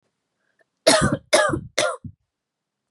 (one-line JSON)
{"three_cough_length": "2.9 s", "three_cough_amplitude": 32404, "three_cough_signal_mean_std_ratio": 0.39, "survey_phase": "beta (2021-08-13 to 2022-03-07)", "age": "18-44", "gender": "Female", "wearing_mask": "No", "symptom_cough_any": true, "symptom_runny_or_blocked_nose": true, "symptom_sore_throat": true, "symptom_fatigue": true, "symptom_headache": true, "symptom_change_to_sense_of_smell_or_taste": true, "symptom_onset": "4 days", "smoker_status": "Never smoked", "respiratory_condition_asthma": false, "respiratory_condition_other": false, "recruitment_source": "Test and Trace", "submission_delay": "2 days", "covid_test_result": "Positive", "covid_test_method": "RT-qPCR", "covid_ct_value": 20.6, "covid_ct_gene": "ORF1ab gene", "covid_ct_mean": 21.0, "covid_viral_load": "130000 copies/ml", "covid_viral_load_category": "Low viral load (10K-1M copies/ml)"}